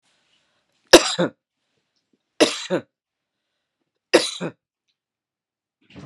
{"three_cough_length": "6.1 s", "three_cough_amplitude": 32768, "three_cough_signal_mean_std_ratio": 0.21, "survey_phase": "beta (2021-08-13 to 2022-03-07)", "age": "45-64", "gender": "Female", "wearing_mask": "No", "symptom_sore_throat": true, "smoker_status": "Never smoked", "respiratory_condition_asthma": false, "respiratory_condition_other": false, "recruitment_source": "REACT", "submission_delay": "5 days", "covid_test_result": "Negative", "covid_test_method": "RT-qPCR"}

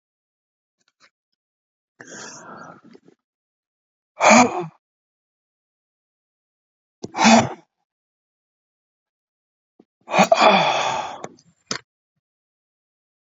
{"exhalation_length": "13.2 s", "exhalation_amplitude": 30747, "exhalation_signal_mean_std_ratio": 0.27, "survey_phase": "beta (2021-08-13 to 2022-03-07)", "age": "45-64", "gender": "Male", "wearing_mask": "Yes", "symptom_none": true, "smoker_status": "Never smoked", "respiratory_condition_asthma": false, "respiratory_condition_other": false, "recruitment_source": "REACT", "submission_delay": "10 days", "covid_test_result": "Negative", "covid_test_method": "RT-qPCR", "influenza_a_test_result": "Negative", "influenza_b_test_result": "Negative"}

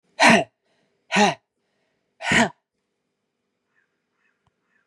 {"exhalation_length": "4.9 s", "exhalation_amplitude": 26724, "exhalation_signal_mean_std_ratio": 0.29, "survey_phase": "beta (2021-08-13 to 2022-03-07)", "age": "45-64", "gender": "Female", "wearing_mask": "No", "symptom_cough_any": true, "symptom_runny_or_blocked_nose": true, "symptom_abdominal_pain": true, "symptom_diarrhoea": true, "symptom_headache": true, "symptom_other": true, "smoker_status": "Ex-smoker", "respiratory_condition_asthma": false, "respiratory_condition_other": false, "recruitment_source": "Test and Trace", "submission_delay": "2 days", "covid_test_result": "Positive", "covid_test_method": "RT-qPCR", "covid_ct_value": 19.3, "covid_ct_gene": "ORF1ab gene"}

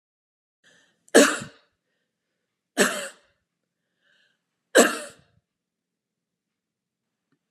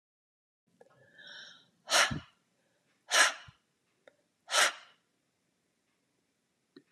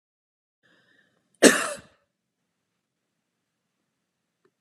{"three_cough_length": "7.5 s", "three_cough_amplitude": 30371, "three_cough_signal_mean_std_ratio": 0.21, "exhalation_length": "6.9 s", "exhalation_amplitude": 8833, "exhalation_signal_mean_std_ratio": 0.26, "cough_length": "4.6 s", "cough_amplitude": 32691, "cough_signal_mean_std_ratio": 0.15, "survey_phase": "alpha (2021-03-01 to 2021-08-12)", "age": "65+", "gender": "Female", "wearing_mask": "No", "symptom_none": true, "smoker_status": "Never smoked", "respiratory_condition_asthma": false, "respiratory_condition_other": false, "recruitment_source": "REACT", "submission_delay": "3 days", "covid_test_result": "Negative", "covid_test_method": "RT-qPCR"}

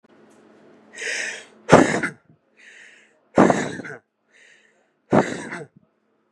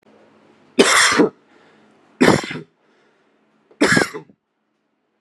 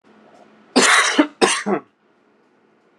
{"exhalation_length": "6.3 s", "exhalation_amplitude": 32768, "exhalation_signal_mean_std_ratio": 0.31, "three_cough_length": "5.2 s", "three_cough_amplitude": 32768, "three_cough_signal_mean_std_ratio": 0.36, "cough_length": "3.0 s", "cough_amplitude": 32767, "cough_signal_mean_std_ratio": 0.42, "survey_phase": "beta (2021-08-13 to 2022-03-07)", "age": "18-44", "gender": "Male", "wearing_mask": "No", "symptom_none": true, "smoker_status": "Ex-smoker", "respiratory_condition_asthma": false, "respiratory_condition_other": false, "recruitment_source": "REACT", "submission_delay": "3 days", "covid_test_result": "Negative", "covid_test_method": "RT-qPCR"}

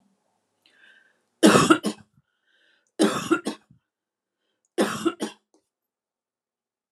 {"three_cough_length": "6.9 s", "three_cough_amplitude": 26371, "three_cough_signal_mean_std_ratio": 0.29, "survey_phase": "beta (2021-08-13 to 2022-03-07)", "age": "45-64", "gender": "Female", "wearing_mask": "No", "symptom_none": true, "smoker_status": "Ex-smoker", "respiratory_condition_asthma": false, "respiratory_condition_other": false, "recruitment_source": "REACT", "submission_delay": "1 day", "covid_test_method": "RT-qPCR"}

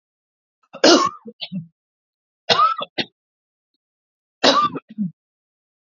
{"three_cough_length": "5.8 s", "three_cough_amplitude": 31009, "three_cough_signal_mean_std_ratio": 0.34, "survey_phase": "beta (2021-08-13 to 2022-03-07)", "age": "45-64", "gender": "Female", "wearing_mask": "No", "symptom_none": true, "symptom_onset": "5 days", "smoker_status": "Ex-smoker", "respiratory_condition_asthma": true, "respiratory_condition_other": false, "recruitment_source": "REACT", "submission_delay": "3 days", "covid_test_result": "Negative", "covid_test_method": "RT-qPCR", "influenza_a_test_result": "Negative", "influenza_b_test_result": "Negative"}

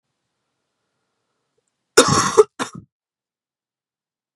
{"cough_length": "4.4 s", "cough_amplitude": 32768, "cough_signal_mean_std_ratio": 0.23, "survey_phase": "beta (2021-08-13 to 2022-03-07)", "age": "18-44", "gender": "Female", "wearing_mask": "No", "symptom_cough_any": true, "symptom_new_continuous_cough": true, "symptom_runny_or_blocked_nose": true, "symptom_sore_throat": true, "symptom_abdominal_pain": true, "symptom_fever_high_temperature": true, "symptom_headache": true, "symptom_change_to_sense_of_smell_or_taste": true, "symptom_loss_of_taste": true, "symptom_onset": "4 days", "smoker_status": "Never smoked", "respiratory_condition_asthma": false, "respiratory_condition_other": false, "recruitment_source": "Test and Trace", "submission_delay": "2 days", "covid_test_result": "Positive", "covid_test_method": "RT-qPCR", "covid_ct_value": 15.1, "covid_ct_gene": "ORF1ab gene", "covid_ct_mean": 15.4, "covid_viral_load": "9200000 copies/ml", "covid_viral_load_category": "High viral load (>1M copies/ml)"}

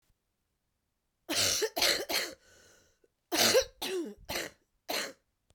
{"cough_length": "5.5 s", "cough_amplitude": 9607, "cough_signal_mean_std_ratio": 0.45, "survey_phase": "beta (2021-08-13 to 2022-03-07)", "age": "45-64", "gender": "Female", "wearing_mask": "No", "symptom_cough_any": true, "symptom_runny_or_blocked_nose": true, "symptom_other": true, "symptom_onset": "3 days", "smoker_status": "Never smoked", "respiratory_condition_asthma": false, "respiratory_condition_other": false, "recruitment_source": "Test and Trace", "submission_delay": "1 day", "covid_test_result": "Positive", "covid_test_method": "RT-qPCR", "covid_ct_value": 38.3, "covid_ct_gene": "N gene"}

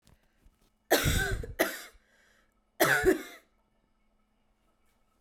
{"cough_length": "5.2 s", "cough_amplitude": 11855, "cough_signal_mean_std_ratio": 0.36, "survey_phase": "beta (2021-08-13 to 2022-03-07)", "age": "18-44", "gender": "Female", "wearing_mask": "No", "symptom_cough_any": true, "symptom_fatigue": true, "symptom_fever_high_temperature": true, "symptom_headache": true, "smoker_status": "Never smoked", "respiratory_condition_asthma": false, "respiratory_condition_other": false, "recruitment_source": "Test and Trace", "submission_delay": "1 day", "covid_test_result": "Positive", "covid_test_method": "RT-qPCR", "covid_ct_value": 16.4, "covid_ct_gene": "ORF1ab gene", "covid_ct_mean": 16.9, "covid_viral_load": "2900000 copies/ml", "covid_viral_load_category": "High viral load (>1M copies/ml)"}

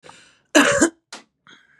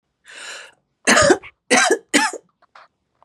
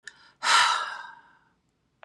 {"cough_length": "1.8 s", "cough_amplitude": 30951, "cough_signal_mean_std_ratio": 0.36, "three_cough_length": "3.2 s", "three_cough_amplitude": 30306, "three_cough_signal_mean_std_ratio": 0.41, "exhalation_length": "2.0 s", "exhalation_amplitude": 15251, "exhalation_signal_mean_std_ratio": 0.4, "survey_phase": "beta (2021-08-13 to 2022-03-07)", "age": "45-64", "gender": "Female", "wearing_mask": "No", "symptom_none": true, "smoker_status": "Never smoked", "respiratory_condition_asthma": false, "respiratory_condition_other": false, "recruitment_source": "REACT", "submission_delay": "1 day", "covid_test_result": "Negative", "covid_test_method": "RT-qPCR", "influenza_a_test_result": "Unknown/Void", "influenza_b_test_result": "Unknown/Void"}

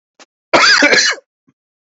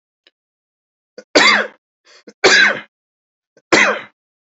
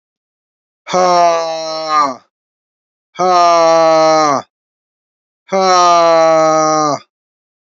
{"cough_length": "2.0 s", "cough_amplitude": 32181, "cough_signal_mean_std_ratio": 0.49, "three_cough_length": "4.4 s", "three_cough_amplitude": 31355, "three_cough_signal_mean_std_ratio": 0.37, "exhalation_length": "7.7 s", "exhalation_amplitude": 29814, "exhalation_signal_mean_std_ratio": 0.64, "survey_phase": "beta (2021-08-13 to 2022-03-07)", "age": "18-44", "gender": "Male", "wearing_mask": "No", "symptom_cough_any": true, "symptom_new_continuous_cough": true, "symptom_fatigue": true, "symptom_onset": "5 days", "smoker_status": "Never smoked", "respiratory_condition_asthma": false, "respiratory_condition_other": false, "recruitment_source": "Test and Trace", "submission_delay": "2 days", "covid_test_result": "Positive", "covid_test_method": "RT-qPCR", "covid_ct_value": 31.9, "covid_ct_gene": "ORF1ab gene"}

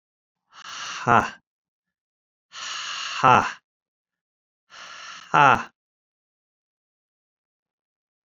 {"exhalation_length": "8.3 s", "exhalation_amplitude": 28615, "exhalation_signal_mean_std_ratio": 0.26, "survey_phase": "beta (2021-08-13 to 2022-03-07)", "age": "65+", "gender": "Male", "wearing_mask": "No", "symptom_runny_or_blocked_nose": true, "symptom_abdominal_pain": true, "smoker_status": "Ex-smoker", "respiratory_condition_asthma": false, "respiratory_condition_other": false, "recruitment_source": "REACT", "submission_delay": "2 days", "covid_test_result": "Negative", "covid_test_method": "RT-qPCR"}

